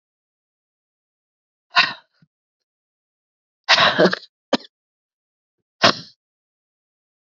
exhalation_length: 7.3 s
exhalation_amplitude: 32768
exhalation_signal_mean_std_ratio: 0.24
survey_phase: alpha (2021-03-01 to 2021-08-12)
age: 45-64
gender: Female
wearing_mask: 'No'
symptom_cough_any: true
symptom_shortness_of_breath: true
symptom_headache: true
symptom_loss_of_taste: true
symptom_onset: 4 days
smoker_status: Never smoked
respiratory_condition_asthma: false
respiratory_condition_other: false
recruitment_source: Test and Trace
submission_delay: 1 day
covid_test_result: Positive
covid_test_method: RT-qPCR
covid_ct_value: 20.0
covid_ct_gene: ORF1ab gene
covid_ct_mean: 20.6
covid_viral_load: 170000 copies/ml
covid_viral_load_category: Low viral load (10K-1M copies/ml)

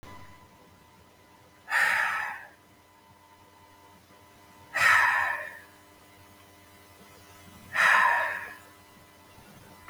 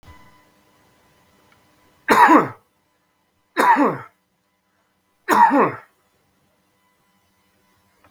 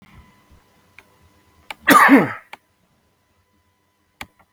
exhalation_length: 9.9 s
exhalation_amplitude: 13520
exhalation_signal_mean_std_ratio: 0.41
three_cough_length: 8.1 s
three_cough_amplitude: 32768
three_cough_signal_mean_std_ratio: 0.31
cough_length: 4.5 s
cough_amplitude: 32768
cough_signal_mean_std_ratio: 0.26
survey_phase: beta (2021-08-13 to 2022-03-07)
age: 45-64
gender: Male
wearing_mask: 'No'
symptom_none: true
smoker_status: Never smoked
respiratory_condition_asthma: false
respiratory_condition_other: false
recruitment_source: REACT
submission_delay: 2 days
covid_test_result: Negative
covid_test_method: RT-qPCR
influenza_a_test_result: Negative
influenza_b_test_result: Negative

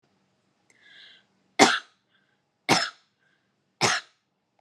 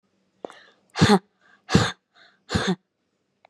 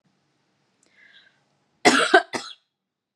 three_cough_length: 4.6 s
three_cough_amplitude: 31419
three_cough_signal_mean_std_ratio: 0.25
exhalation_length: 3.5 s
exhalation_amplitude: 25319
exhalation_signal_mean_std_ratio: 0.32
cough_length: 3.2 s
cough_amplitude: 32413
cough_signal_mean_std_ratio: 0.26
survey_phase: beta (2021-08-13 to 2022-03-07)
age: 18-44
gender: Female
wearing_mask: 'No'
symptom_fatigue: true
symptom_headache: true
symptom_onset: 12 days
smoker_status: Never smoked
respiratory_condition_asthma: false
respiratory_condition_other: false
recruitment_source: REACT
submission_delay: 3 days
covid_test_result: Negative
covid_test_method: RT-qPCR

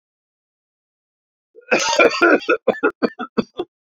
cough_length: 3.9 s
cough_amplitude: 27443
cough_signal_mean_std_ratio: 0.4
survey_phase: beta (2021-08-13 to 2022-03-07)
age: 45-64
gender: Male
wearing_mask: 'No'
symptom_cough_any: true
symptom_fever_high_temperature: true
symptom_change_to_sense_of_smell_or_taste: true
symptom_onset: 3 days
smoker_status: Ex-smoker
respiratory_condition_asthma: false
respiratory_condition_other: false
recruitment_source: Test and Trace
submission_delay: 1 day
covid_test_result: Positive
covid_test_method: RT-qPCR
covid_ct_value: 15.5
covid_ct_gene: ORF1ab gene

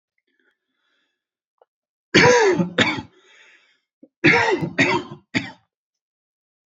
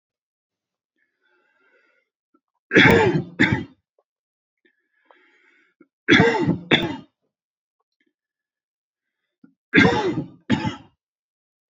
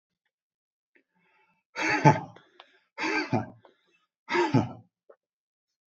cough_length: 6.7 s
cough_amplitude: 29267
cough_signal_mean_std_ratio: 0.38
three_cough_length: 11.7 s
three_cough_amplitude: 30302
three_cough_signal_mean_std_ratio: 0.32
exhalation_length: 5.9 s
exhalation_amplitude: 25344
exhalation_signal_mean_std_ratio: 0.32
survey_phase: beta (2021-08-13 to 2022-03-07)
age: 45-64
gender: Male
wearing_mask: 'No'
symptom_cough_any: true
symptom_fatigue: true
symptom_onset: 7 days
smoker_status: Never smoked
respiratory_condition_asthma: false
respiratory_condition_other: false
recruitment_source: REACT
submission_delay: 1 day
covid_test_result: Negative
covid_test_method: RT-qPCR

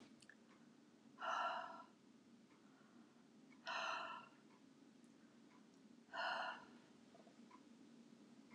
exhalation_length: 8.5 s
exhalation_amplitude: 825
exhalation_signal_mean_std_ratio: 0.51
survey_phase: beta (2021-08-13 to 2022-03-07)
age: 65+
gender: Female
wearing_mask: 'No'
symptom_other: true
symptom_onset: 12 days
smoker_status: Never smoked
respiratory_condition_asthma: false
respiratory_condition_other: false
recruitment_source: REACT
submission_delay: 1 day
covid_test_result: Negative
covid_test_method: RT-qPCR
influenza_a_test_result: Negative
influenza_b_test_result: Negative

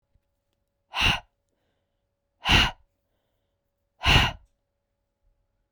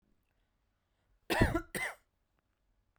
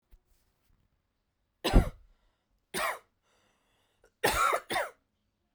exhalation_length: 5.7 s
exhalation_amplitude: 16580
exhalation_signal_mean_std_ratio: 0.28
cough_length: 3.0 s
cough_amplitude: 7433
cough_signal_mean_std_ratio: 0.29
three_cough_length: 5.5 s
three_cough_amplitude: 10816
three_cough_signal_mean_std_ratio: 0.3
survey_phase: beta (2021-08-13 to 2022-03-07)
age: 18-44
gender: Female
wearing_mask: 'No'
symptom_fatigue: true
symptom_headache: true
smoker_status: Ex-smoker
respiratory_condition_asthma: false
respiratory_condition_other: false
recruitment_source: Test and Trace
submission_delay: 2 days
covid_test_result: Positive
covid_test_method: RT-qPCR
covid_ct_value: 27.0
covid_ct_gene: N gene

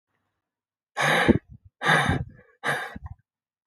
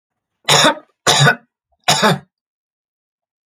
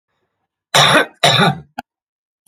exhalation_length: 3.7 s
exhalation_amplitude: 23785
exhalation_signal_mean_std_ratio: 0.42
three_cough_length: 3.5 s
three_cough_amplitude: 32768
three_cough_signal_mean_std_ratio: 0.4
cough_length: 2.5 s
cough_amplitude: 31786
cough_signal_mean_std_ratio: 0.43
survey_phase: beta (2021-08-13 to 2022-03-07)
age: 18-44
gender: Male
wearing_mask: 'No'
symptom_none: true
smoker_status: Never smoked
respiratory_condition_asthma: false
respiratory_condition_other: false
recruitment_source: REACT
submission_delay: 0 days
covid_test_result: Negative
covid_test_method: RT-qPCR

